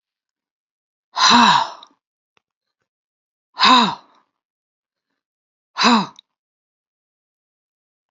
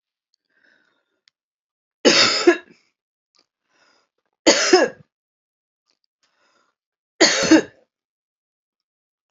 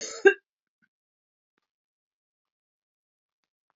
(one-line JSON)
{"exhalation_length": "8.1 s", "exhalation_amplitude": 30073, "exhalation_signal_mean_std_ratio": 0.3, "three_cough_length": "9.3 s", "three_cough_amplitude": 29665, "three_cough_signal_mean_std_ratio": 0.28, "cough_length": "3.8 s", "cough_amplitude": 24268, "cough_signal_mean_std_ratio": 0.13, "survey_phase": "beta (2021-08-13 to 2022-03-07)", "age": "65+", "gender": "Female", "wearing_mask": "No", "symptom_none": true, "smoker_status": "Ex-smoker", "respiratory_condition_asthma": false, "respiratory_condition_other": false, "recruitment_source": "REACT", "submission_delay": "2 days", "covid_test_result": "Negative", "covid_test_method": "RT-qPCR", "influenza_a_test_result": "Negative", "influenza_b_test_result": "Negative"}